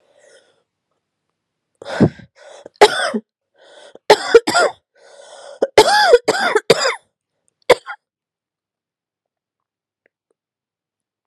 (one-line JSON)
{"three_cough_length": "11.3 s", "three_cough_amplitude": 32768, "three_cough_signal_mean_std_ratio": 0.3, "survey_phase": "beta (2021-08-13 to 2022-03-07)", "age": "18-44", "gender": "Female", "wearing_mask": "No", "symptom_cough_any": true, "symptom_runny_or_blocked_nose": true, "symptom_shortness_of_breath": true, "symptom_fatigue": true, "symptom_fever_high_temperature": true, "symptom_headache": true, "symptom_change_to_sense_of_smell_or_taste": true, "symptom_loss_of_taste": true, "symptom_other": true, "symptom_onset": "2 days", "smoker_status": "Ex-smoker", "respiratory_condition_asthma": false, "respiratory_condition_other": false, "recruitment_source": "Test and Trace", "submission_delay": "2 days", "covid_test_result": "Positive", "covid_test_method": "RT-qPCR", "covid_ct_value": 16.8, "covid_ct_gene": "S gene", "covid_ct_mean": 17.6, "covid_viral_load": "1700000 copies/ml", "covid_viral_load_category": "High viral load (>1M copies/ml)"}